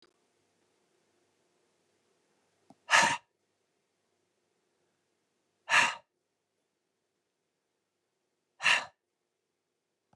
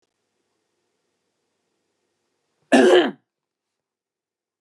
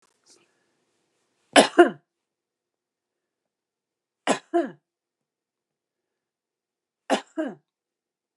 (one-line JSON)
{"exhalation_length": "10.2 s", "exhalation_amplitude": 12821, "exhalation_signal_mean_std_ratio": 0.2, "cough_length": "4.6 s", "cough_amplitude": 25210, "cough_signal_mean_std_ratio": 0.23, "three_cough_length": "8.4 s", "three_cough_amplitude": 32744, "three_cough_signal_mean_std_ratio": 0.18, "survey_phase": "beta (2021-08-13 to 2022-03-07)", "age": "45-64", "gender": "Female", "wearing_mask": "No", "symptom_fatigue": true, "symptom_headache": true, "smoker_status": "Never smoked", "respiratory_condition_asthma": false, "respiratory_condition_other": false, "recruitment_source": "REACT", "submission_delay": "1 day", "covid_test_result": "Negative", "covid_test_method": "RT-qPCR"}